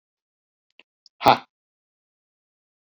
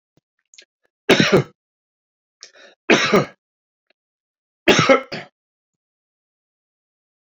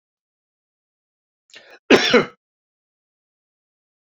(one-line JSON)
{"exhalation_length": "3.0 s", "exhalation_amplitude": 28245, "exhalation_signal_mean_std_ratio": 0.14, "three_cough_length": "7.3 s", "three_cough_amplitude": 32767, "three_cough_signal_mean_std_ratio": 0.28, "cough_length": "4.1 s", "cough_amplitude": 28678, "cough_signal_mean_std_ratio": 0.2, "survey_phase": "beta (2021-08-13 to 2022-03-07)", "age": "45-64", "gender": "Male", "wearing_mask": "No", "symptom_none": true, "smoker_status": "Never smoked", "respiratory_condition_asthma": false, "respiratory_condition_other": false, "recruitment_source": "REACT", "submission_delay": "2 days", "covid_test_result": "Negative", "covid_test_method": "RT-qPCR"}